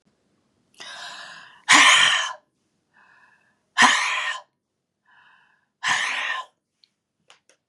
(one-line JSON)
{"exhalation_length": "7.7 s", "exhalation_amplitude": 29596, "exhalation_signal_mean_std_ratio": 0.36, "survey_phase": "beta (2021-08-13 to 2022-03-07)", "age": "45-64", "gender": "Female", "wearing_mask": "No", "symptom_none": true, "smoker_status": "Ex-smoker", "respiratory_condition_asthma": true, "respiratory_condition_other": false, "recruitment_source": "REACT", "submission_delay": "1 day", "covid_test_result": "Negative", "covid_test_method": "RT-qPCR", "influenza_a_test_result": "Negative", "influenza_b_test_result": "Negative"}